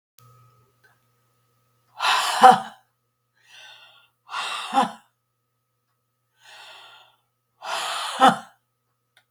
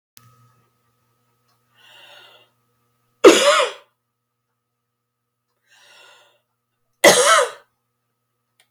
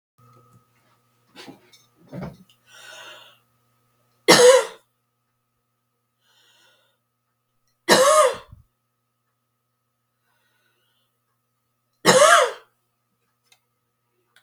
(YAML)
exhalation_length: 9.3 s
exhalation_amplitude: 32767
exhalation_signal_mean_std_ratio: 0.27
cough_length: 8.7 s
cough_amplitude: 32767
cough_signal_mean_std_ratio: 0.24
three_cough_length: 14.4 s
three_cough_amplitude: 32749
three_cough_signal_mean_std_ratio: 0.25
survey_phase: beta (2021-08-13 to 2022-03-07)
age: 65+
gender: Female
wearing_mask: 'No'
symptom_cough_any: true
symptom_runny_or_blocked_nose: true
symptom_shortness_of_breath: true
symptom_diarrhoea: true
symptom_fatigue: true
smoker_status: Ex-smoker
respiratory_condition_asthma: true
respiratory_condition_other: false
recruitment_source: Test and Trace
submission_delay: 1 day
covid_test_result: Negative
covid_test_method: RT-qPCR